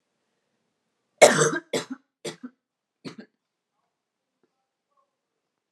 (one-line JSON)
{"cough_length": "5.7 s", "cough_amplitude": 30786, "cough_signal_mean_std_ratio": 0.2, "survey_phase": "alpha (2021-03-01 to 2021-08-12)", "age": "18-44", "gender": "Female", "wearing_mask": "No", "symptom_cough_any": true, "symptom_shortness_of_breath": true, "symptom_fatigue": true, "symptom_headache": true, "symptom_change_to_sense_of_smell_or_taste": true, "smoker_status": "Ex-smoker", "respiratory_condition_asthma": false, "respiratory_condition_other": false, "recruitment_source": "Test and Trace", "submission_delay": "1 day", "covid_test_result": "Positive", "covid_test_method": "RT-qPCR"}